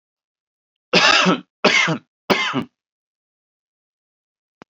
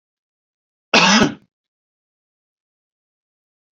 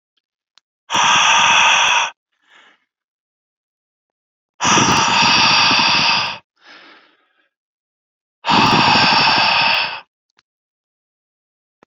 {
  "three_cough_length": "4.7 s",
  "three_cough_amplitude": 32565,
  "three_cough_signal_mean_std_ratio": 0.38,
  "cough_length": "3.8 s",
  "cough_amplitude": 28514,
  "cough_signal_mean_std_ratio": 0.25,
  "exhalation_length": "11.9 s",
  "exhalation_amplitude": 31067,
  "exhalation_signal_mean_std_ratio": 0.54,
  "survey_phase": "beta (2021-08-13 to 2022-03-07)",
  "age": "18-44",
  "gender": "Male",
  "wearing_mask": "No",
  "symptom_runny_or_blocked_nose": true,
  "smoker_status": "Never smoked",
  "respiratory_condition_asthma": false,
  "respiratory_condition_other": false,
  "recruitment_source": "Test and Trace",
  "submission_delay": "1 day",
  "covid_test_result": "Positive",
  "covid_test_method": "ePCR"
}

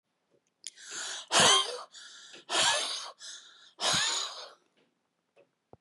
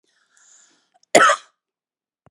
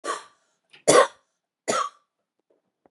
{
  "exhalation_length": "5.8 s",
  "exhalation_amplitude": 10932,
  "exhalation_signal_mean_std_ratio": 0.44,
  "cough_length": "2.3 s",
  "cough_amplitude": 32768,
  "cough_signal_mean_std_ratio": 0.24,
  "three_cough_length": "2.9 s",
  "three_cough_amplitude": 25404,
  "three_cough_signal_mean_std_ratio": 0.29,
  "survey_phase": "beta (2021-08-13 to 2022-03-07)",
  "age": "45-64",
  "gender": "Female",
  "wearing_mask": "No",
  "symptom_none": true,
  "smoker_status": "Never smoked",
  "respiratory_condition_asthma": true,
  "respiratory_condition_other": false,
  "recruitment_source": "REACT",
  "submission_delay": "2 days",
  "covid_test_result": "Negative",
  "covid_test_method": "RT-qPCR",
  "influenza_a_test_result": "Negative",
  "influenza_b_test_result": "Negative"
}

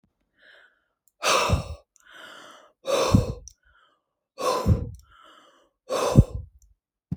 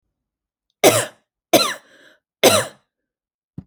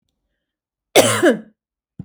{
  "exhalation_length": "7.2 s",
  "exhalation_amplitude": 26032,
  "exhalation_signal_mean_std_ratio": 0.37,
  "three_cough_length": "3.7 s",
  "three_cough_amplitude": 32767,
  "three_cough_signal_mean_std_ratio": 0.31,
  "cough_length": "2.0 s",
  "cough_amplitude": 32767,
  "cough_signal_mean_std_ratio": 0.34,
  "survey_phase": "alpha (2021-03-01 to 2021-08-12)",
  "age": "45-64",
  "gender": "Female",
  "wearing_mask": "No",
  "symptom_none": true,
  "smoker_status": "Never smoked",
  "respiratory_condition_asthma": true,
  "respiratory_condition_other": false,
  "recruitment_source": "REACT",
  "submission_delay": "2 days",
  "covid_test_method": "RT-qPCR"
}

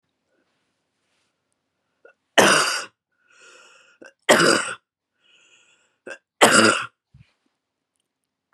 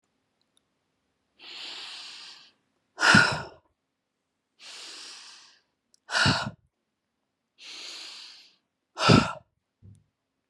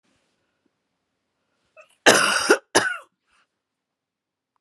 {
  "three_cough_length": "8.5 s",
  "three_cough_amplitude": 32757,
  "three_cough_signal_mean_std_ratio": 0.29,
  "exhalation_length": "10.5 s",
  "exhalation_amplitude": 20263,
  "exhalation_signal_mean_std_ratio": 0.28,
  "cough_length": "4.6 s",
  "cough_amplitude": 32767,
  "cough_signal_mean_std_ratio": 0.28,
  "survey_phase": "beta (2021-08-13 to 2022-03-07)",
  "age": "18-44",
  "gender": "Female",
  "wearing_mask": "No",
  "symptom_none": true,
  "smoker_status": "Never smoked",
  "respiratory_condition_asthma": false,
  "respiratory_condition_other": false,
  "recruitment_source": "REACT",
  "submission_delay": "2 days",
  "covid_test_result": "Negative",
  "covid_test_method": "RT-qPCR",
  "influenza_a_test_result": "Negative",
  "influenza_b_test_result": "Negative"
}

